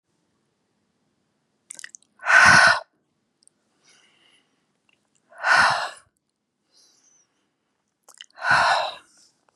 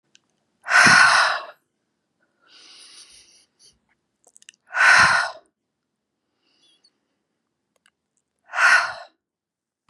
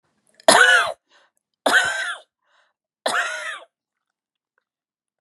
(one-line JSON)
{"cough_length": "9.6 s", "cough_amplitude": 27589, "cough_signal_mean_std_ratio": 0.3, "exhalation_length": "9.9 s", "exhalation_amplitude": 26965, "exhalation_signal_mean_std_ratio": 0.32, "three_cough_length": "5.2 s", "three_cough_amplitude": 32186, "three_cough_signal_mean_std_ratio": 0.36, "survey_phase": "beta (2021-08-13 to 2022-03-07)", "age": "65+", "gender": "Female", "wearing_mask": "No", "symptom_none": true, "smoker_status": "Ex-smoker", "respiratory_condition_asthma": false, "respiratory_condition_other": true, "recruitment_source": "REACT", "submission_delay": "2 days", "covid_test_result": "Negative", "covid_test_method": "RT-qPCR", "influenza_a_test_result": "Negative", "influenza_b_test_result": "Negative"}